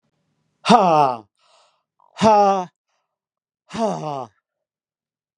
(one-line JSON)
{"exhalation_length": "5.4 s", "exhalation_amplitude": 32767, "exhalation_signal_mean_std_ratio": 0.37, "survey_phase": "beta (2021-08-13 to 2022-03-07)", "age": "45-64", "gender": "Male", "wearing_mask": "No", "symptom_cough_any": true, "symptom_runny_or_blocked_nose": true, "symptom_fatigue": true, "symptom_headache": true, "symptom_change_to_sense_of_smell_or_taste": true, "symptom_onset": "2 days", "smoker_status": "Never smoked", "respiratory_condition_asthma": false, "respiratory_condition_other": false, "recruitment_source": "Test and Trace", "submission_delay": "1 day", "covid_test_result": "Positive", "covid_test_method": "RT-qPCR", "covid_ct_value": 25.3, "covid_ct_gene": "N gene"}